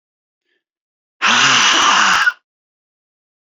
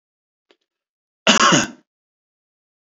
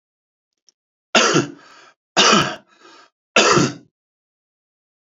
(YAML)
exhalation_length: 3.5 s
exhalation_amplitude: 32625
exhalation_signal_mean_std_ratio: 0.49
cough_length: 2.9 s
cough_amplitude: 31137
cough_signal_mean_std_ratio: 0.29
three_cough_length: 5.0 s
three_cough_amplitude: 32768
three_cough_signal_mean_std_ratio: 0.37
survey_phase: beta (2021-08-13 to 2022-03-07)
age: 45-64
gender: Male
wearing_mask: 'No'
symptom_none: true
smoker_status: Ex-smoker
respiratory_condition_asthma: false
respiratory_condition_other: false
recruitment_source: REACT
submission_delay: 1 day
covid_test_result: Negative
covid_test_method: RT-qPCR